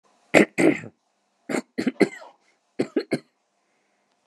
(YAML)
three_cough_length: 4.3 s
three_cough_amplitude: 32768
three_cough_signal_mean_std_ratio: 0.3
survey_phase: beta (2021-08-13 to 2022-03-07)
age: 45-64
gender: Male
wearing_mask: 'No'
symptom_abdominal_pain: true
smoker_status: Never smoked
respiratory_condition_asthma: false
respiratory_condition_other: false
recruitment_source: REACT
submission_delay: 1 day
covid_test_result: Negative
covid_test_method: RT-qPCR